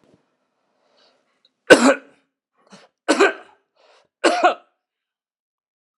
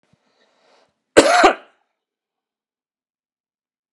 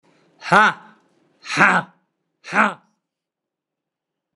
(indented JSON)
{
  "three_cough_length": "6.0 s",
  "three_cough_amplitude": 32768,
  "three_cough_signal_mean_std_ratio": 0.26,
  "cough_length": "3.9 s",
  "cough_amplitude": 32768,
  "cough_signal_mean_std_ratio": 0.23,
  "exhalation_length": "4.4 s",
  "exhalation_amplitude": 32767,
  "exhalation_signal_mean_std_ratio": 0.3,
  "survey_phase": "alpha (2021-03-01 to 2021-08-12)",
  "age": "65+",
  "gender": "Male",
  "wearing_mask": "Yes",
  "symptom_cough_any": true,
  "symptom_shortness_of_breath": true,
  "symptom_onset": "5 days",
  "smoker_status": "Never smoked",
  "respiratory_condition_asthma": false,
  "respiratory_condition_other": false,
  "recruitment_source": "Test and Trace",
  "submission_delay": "2 days",
  "covid_test_result": "Positive",
  "covid_test_method": "RT-qPCR",
  "covid_ct_value": 12.9,
  "covid_ct_gene": "S gene",
  "covid_ct_mean": 13.2,
  "covid_viral_load": "45000000 copies/ml",
  "covid_viral_load_category": "High viral load (>1M copies/ml)"
}